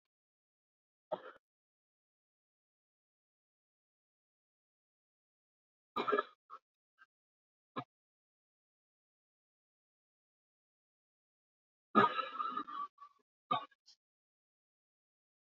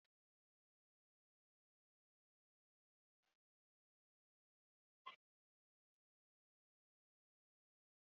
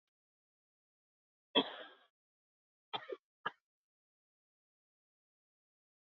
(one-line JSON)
{"three_cough_length": "15.4 s", "three_cough_amplitude": 5893, "three_cough_signal_mean_std_ratio": 0.19, "exhalation_length": "8.0 s", "exhalation_amplitude": 298, "exhalation_signal_mean_std_ratio": 0.07, "cough_length": "6.1 s", "cough_amplitude": 5144, "cough_signal_mean_std_ratio": 0.15, "survey_phase": "beta (2021-08-13 to 2022-03-07)", "age": "45-64", "gender": "Female", "wearing_mask": "No", "symptom_cough_any": true, "symptom_shortness_of_breath": true, "symptom_fatigue": true, "symptom_headache": true, "symptom_onset": "12 days", "smoker_status": "Current smoker (1 to 10 cigarettes per day)", "respiratory_condition_asthma": true, "respiratory_condition_other": false, "recruitment_source": "REACT", "submission_delay": "4 days", "covid_test_result": "Negative", "covid_test_method": "RT-qPCR", "influenza_a_test_result": "Unknown/Void", "influenza_b_test_result": "Unknown/Void"}